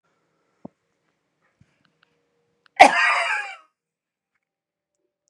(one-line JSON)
{"cough_length": "5.3 s", "cough_amplitude": 32768, "cough_signal_mean_std_ratio": 0.22, "survey_phase": "beta (2021-08-13 to 2022-03-07)", "age": "45-64", "gender": "Female", "wearing_mask": "No", "symptom_runny_or_blocked_nose": true, "symptom_fatigue": true, "symptom_headache": true, "smoker_status": "Ex-smoker", "respiratory_condition_asthma": false, "respiratory_condition_other": false, "recruitment_source": "REACT", "submission_delay": "1 day", "covid_test_result": "Negative", "covid_test_method": "RT-qPCR", "influenza_a_test_result": "Negative", "influenza_b_test_result": "Negative"}